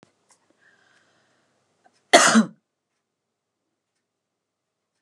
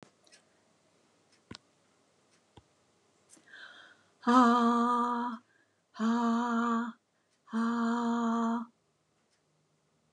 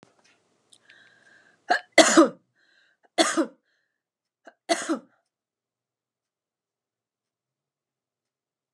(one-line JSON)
{"cough_length": "5.0 s", "cough_amplitude": 32762, "cough_signal_mean_std_ratio": 0.19, "exhalation_length": "10.1 s", "exhalation_amplitude": 10429, "exhalation_signal_mean_std_ratio": 0.49, "three_cough_length": "8.7 s", "three_cough_amplitude": 28101, "three_cough_signal_mean_std_ratio": 0.22, "survey_phase": "beta (2021-08-13 to 2022-03-07)", "age": "65+", "gender": "Female", "wearing_mask": "No", "symptom_none": true, "smoker_status": "Ex-smoker", "respiratory_condition_asthma": false, "respiratory_condition_other": false, "recruitment_source": "REACT", "submission_delay": "1 day", "covid_test_result": "Negative", "covid_test_method": "RT-qPCR"}